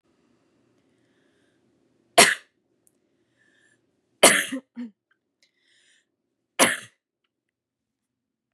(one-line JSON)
{"three_cough_length": "8.5 s", "three_cough_amplitude": 32741, "three_cough_signal_mean_std_ratio": 0.19, "survey_phase": "beta (2021-08-13 to 2022-03-07)", "age": "18-44", "gender": "Female", "wearing_mask": "No", "symptom_cough_any": true, "symptom_runny_or_blocked_nose": true, "smoker_status": "Never smoked", "respiratory_condition_asthma": false, "respiratory_condition_other": false, "recruitment_source": "Test and Trace", "submission_delay": "2 days", "covid_test_result": "Positive", "covid_test_method": "LFT"}